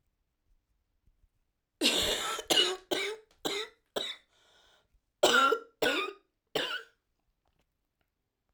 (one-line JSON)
{"cough_length": "8.5 s", "cough_amplitude": 10384, "cough_signal_mean_std_ratio": 0.4, "survey_phase": "alpha (2021-03-01 to 2021-08-12)", "age": "18-44", "gender": "Female", "wearing_mask": "No", "symptom_cough_any": true, "symptom_new_continuous_cough": true, "symptom_shortness_of_breath": true, "symptom_fever_high_temperature": true, "symptom_onset": "3 days", "smoker_status": "Ex-smoker", "respiratory_condition_asthma": false, "respiratory_condition_other": false, "recruitment_source": "Test and Trace", "submission_delay": "1 day", "covid_test_result": "Positive", "covid_test_method": "RT-qPCR", "covid_ct_value": 16.5, "covid_ct_gene": "ORF1ab gene", "covid_ct_mean": 16.8, "covid_viral_load": "3100000 copies/ml", "covid_viral_load_category": "High viral load (>1M copies/ml)"}